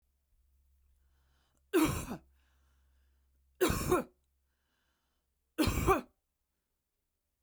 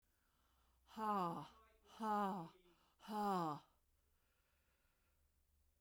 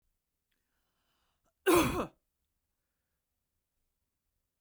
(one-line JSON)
{"three_cough_length": "7.4 s", "three_cough_amplitude": 5576, "three_cough_signal_mean_std_ratio": 0.31, "exhalation_length": "5.8 s", "exhalation_amplitude": 894, "exhalation_signal_mean_std_ratio": 0.44, "cough_length": "4.6 s", "cough_amplitude": 6749, "cough_signal_mean_std_ratio": 0.22, "survey_phase": "beta (2021-08-13 to 2022-03-07)", "age": "45-64", "gender": "Female", "wearing_mask": "No", "symptom_none": true, "smoker_status": "Never smoked", "respiratory_condition_asthma": false, "respiratory_condition_other": false, "recruitment_source": "REACT", "submission_delay": "1 day", "covid_test_result": "Negative", "covid_test_method": "RT-qPCR"}